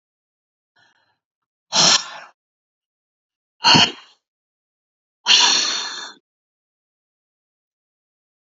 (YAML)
exhalation_length: 8.5 s
exhalation_amplitude: 31891
exhalation_signal_mean_std_ratio: 0.29
survey_phase: alpha (2021-03-01 to 2021-08-12)
age: 65+
gender: Female
wearing_mask: 'No'
symptom_headache: true
smoker_status: Never smoked
respiratory_condition_asthma: false
respiratory_condition_other: false
recruitment_source: REACT
submission_delay: 1 day
covid_test_result: Negative
covid_test_method: RT-qPCR